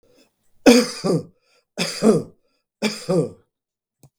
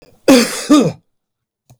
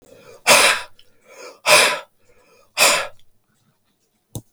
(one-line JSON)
{"three_cough_length": "4.2 s", "three_cough_amplitude": 32768, "three_cough_signal_mean_std_ratio": 0.38, "cough_length": "1.8 s", "cough_amplitude": 32768, "cough_signal_mean_std_ratio": 0.44, "exhalation_length": "4.5 s", "exhalation_amplitude": 32768, "exhalation_signal_mean_std_ratio": 0.37, "survey_phase": "beta (2021-08-13 to 2022-03-07)", "age": "65+", "gender": "Male", "wearing_mask": "No", "symptom_none": true, "smoker_status": "Ex-smoker", "respiratory_condition_asthma": false, "respiratory_condition_other": false, "recruitment_source": "REACT", "submission_delay": "1 day", "covid_test_result": "Negative", "covid_test_method": "RT-qPCR", "influenza_a_test_result": "Negative", "influenza_b_test_result": "Negative"}